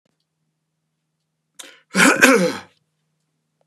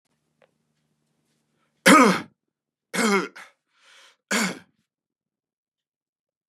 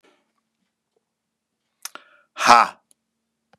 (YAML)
cough_length: 3.7 s
cough_amplitude: 32768
cough_signal_mean_std_ratio: 0.31
three_cough_length: 6.5 s
three_cough_amplitude: 32234
three_cough_signal_mean_std_ratio: 0.26
exhalation_length: 3.6 s
exhalation_amplitude: 32768
exhalation_signal_mean_std_ratio: 0.19
survey_phase: beta (2021-08-13 to 2022-03-07)
age: 45-64
gender: Male
wearing_mask: 'No'
symptom_runny_or_blocked_nose: true
symptom_sore_throat: true
symptom_headache: true
symptom_onset: 3 days
smoker_status: Ex-smoker
respiratory_condition_asthma: false
respiratory_condition_other: false
recruitment_source: Test and Trace
submission_delay: 1 day
covid_test_result: Positive
covid_test_method: RT-qPCR
covid_ct_value: 16.4
covid_ct_gene: ORF1ab gene
covid_ct_mean: 16.5
covid_viral_load: 3800000 copies/ml
covid_viral_load_category: High viral load (>1M copies/ml)